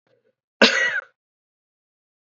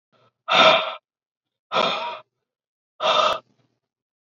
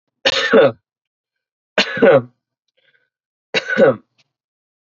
{"cough_length": "2.3 s", "cough_amplitude": 27617, "cough_signal_mean_std_ratio": 0.29, "exhalation_length": "4.4 s", "exhalation_amplitude": 27481, "exhalation_signal_mean_std_ratio": 0.39, "three_cough_length": "4.9 s", "three_cough_amplitude": 30593, "three_cough_signal_mean_std_ratio": 0.38, "survey_phase": "alpha (2021-03-01 to 2021-08-12)", "age": "18-44", "gender": "Male", "wearing_mask": "No", "symptom_fatigue": true, "symptom_fever_high_temperature": true, "symptom_onset": "4 days", "smoker_status": "Never smoked", "respiratory_condition_asthma": false, "respiratory_condition_other": false, "recruitment_source": "Test and Trace", "submission_delay": "1 day", "covid_test_result": "Positive", "covid_test_method": "RT-qPCR", "covid_ct_value": 17.6, "covid_ct_gene": "ORF1ab gene"}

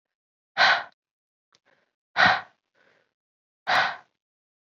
{"exhalation_length": "4.8 s", "exhalation_amplitude": 18844, "exhalation_signal_mean_std_ratio": 0.3, "survey_phase": "beta (2021-08-13 to 2022-03-07)", "age": "18-44", "gender": "Female", "wearing_mask": "No", "symptom_cough_any": true, "symptom_sore_throat": true, "symptom_fatigue": true, "symptom_fever_high_temperature": true, "symptom_onset": "4 days", "smoker_status": "Never smoked", "respiratory_condition_asthma": false, "respiratory_condition_other": false, "recruitment_source": "Test and Trace", "submission_delay": "2 days", "covid_test_result": "Positive", "covid_test_method": "RT-qPCR"}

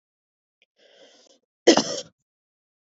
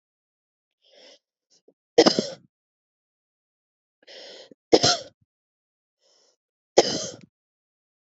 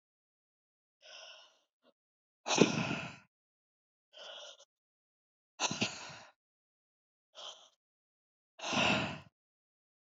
{"cough_length": "3.0 s", "cough_amplitude": 28864, "cough_signal_mean_std_ratio": 0.2, "three_cough_length": "8.0 s", "three_cough_amplitude": 27964, "three_cough_signal_mean_std_ratio": 0.2, "exhalation_length": "10.1 s", "exhalation_amplitude": 11815, "exhalation_signal_mean_std_ratio": 0.29, "survey_phase": "beta (2021-08-13 to 2022-03-07)", "age": "18-44", "gender": "Female", "wearing_mask": "No", "symptom_none": true, "smoker_status": "Never smoked", "respiratory_condition_asthma": false, "respiratory_condition_other": false, "recruitment_source": "REACT", "submission_delay": "1 day", "covid_test_result": "Negative", "covid_test_method": "RT-qPCR"}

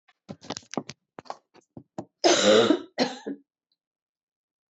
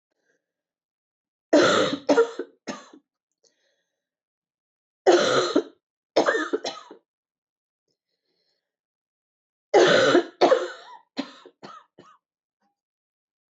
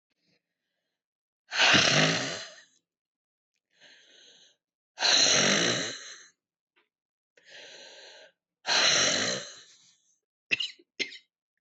{"cough_length": "4.7 s", "cough_amplitude": 17633, "cough_signal_mean_std_ratio": 0.33, "three_cough_length": "13.6 s", "three_cough_amplitude": 17179, "three_cough_signal_mean_std_ratio": 0.33, "exhalation_length": "11.6 s", "exhalation_amplitude": 13788, "exhalation_signal_mean_std_ratio": 0.4, "survey_phase": "beta (2021-08-13 to 2022-03-07)", "age": "45-64", "gender": "Female", "wearing_mask": "No", "symptom_cough_any": true, "symptom_runny_or_blocked_nose": true, "symptom_shortness_of_breath": true, "symptom_sore_throat": true, "symptom_fatigue": true, "symptom_headache": true, "symptom_change_to_sense_of_smell_or_taste": true, "symptom_other": true, "symptom_onset": "6 days", "smoker_status": "Ex-smoker", "respiratory_condition_asthma": true, "respiratory_condition_other": false, "recruitment_source": "Test and Trace", "submission_delay": "1 day", "covid_test_result": "Positive", "covid_test_method": "RT-qPCR", "covid_ct_value": 18.2, "covid_ct_gene": "ORF1ab gene", "covid_ct_mean": 18.6, "covid_viral_load": "810000 copies/ml", "covid_viral_load_category": "Low viral load (10K-1M copies/ml)"}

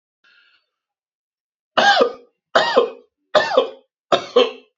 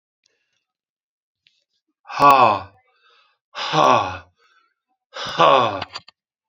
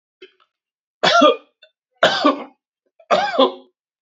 {"cough_length": "4.8 s", "cough_amplitude": 31637, "cough_signal_mean_std_ratio": 0.4, "exhalation_length": "6.5 s", "exhalation_amplitude": 28867, "exhalation_signal_mean_std_ratio": 0.36, "three_cough_length": "4.0 s", "three_cough_amplitude": 29332, "three_cough_signal_mean_std_ratio": 0.41, "survey_phase": "beta (2021-08-13 to 2022-03-07)", "age": "65+", "gender": "Male", "wearing_mask": "No", "symptom_none": true, "smoker_status": "Ex-smoker", "respiratory_condition_asthma": false, "respiratory_condition_other": false, "recruitment_source": "REACT", "submission_delay": "1 day", "covid_test_result": "Negative", "covid_test_method": "RT-qPCR"}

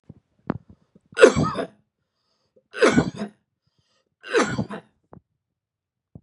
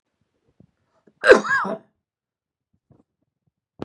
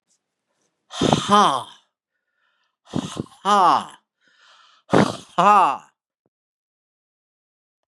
{"three_cough_length": "6.2 s", "three_cough_amplitude": 32768, "three_cough_signal_mean_std_ratio": 0.29, "cough_length": "3.8 s", "cough_amplitude": 32768, "cough_signal_mean_std_ratio": 0.22, "exhalation_length": "7.9 s", "exhalation_amplitude": 31513, "exhalation_signal_mean_std_ratio": 0.34, "survey_phase": "beta (2021-08-13 to 2022-03-07)", "age": "65+", "gender": "Male", "wearing_mask": "No", "symptom_none": true, "symptom_onset": "3 days", "smoker_status": "Never smoked", "respiratory_condition_asthma": false, "respiratory_condition_other": false, "recruitment_source": "Test and Trace", "submission_delay": "2 days", "covid_test_result": "Positive", "covid_test_method": "RT-qPCR", "covid_ct_value": 18.0, "covid_ct_gene": "ORF1ab gene", "covid_ct_mean": 18.1, "covid_viral_load": "1100000 copies/ml", "covid_viral_load_category": "High viral load (>1M copies/ml)"}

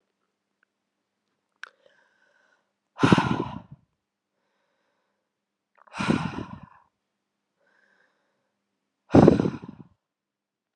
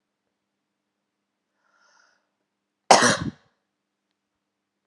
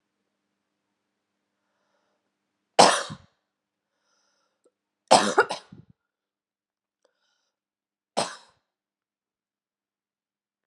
{"exhalation_length": "10.8 s", "exhalation_amplitude": 32764, "exhalation_signal_mean_std_ratio": 0.22, "cough_length": "4.9 s", "cough_amplitude": 32619, "cough_signal_mean_std_ratio": 0.18, "three_cough_length": "10.7 s", "three_cough_amplitude": 32712, "three_cough_signal_mean_std_ratio": 0.17, "survey_phase": "alpha (2021-03-01 to 2021-08-12)", "age": "18-44", "gender": "Female", "wearing_mask": "No", "symptom_shortness_of_breath": true, "symptom_abdominal_pain": true, "symptom_fatigue": true, "symptom_fever_high_temperature": true, "symptom_headache": true, "symptom_onset": "10 days", "smoker_status": "Never smoked", "respiratory_condition_asthma": false, "respiratory_condition_other": false, "recruitment_source": "Test and Trace", "submission_delay": "2 days", "covid_test_result": "Positive", "covid_test_method": "RT-qPCR", "covid_ct_value": 15.7, "covid_ct_gene": "ORF1ab gene", "covid_ct_mean": 16.2, "covid_viral_load": "4900000 copies/ml", "covid_viral_load_category": "High viral load (>1M copies/ml)"}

